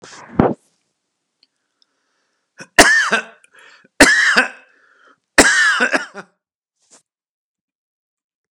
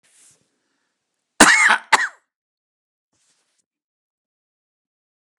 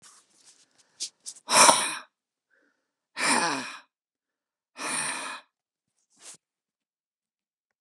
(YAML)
three_cough_length: 8.5 s
three_cough_amplitude: 32768
three_cough_signal_mean_std_ratio: 0.34
cough_length: 5.4 s
cough_amplitude: 32768
cough_signal_mean_std_ratio: 0.23
exhalation_length: 7.8 s
exhalation_amplitude: 31780
exhalation_signal_mean_std_ratio: 0.29
survey_phase: beta (2021-08-13 to 2022-03-07)
age: 65+
gender: Male
wearing_mask: 'No'
symptom_none: true
smoker_status: Never smoked
respiratory_condition_asthma: false
respiratory_condition_other: false
recruitment_source: REACT
submission_delay: 1 day
covid_test_result: Negative
covid_test_method: RT-qPCR
influenza_a_test_result: Negative
influenza_b_test_result: Negative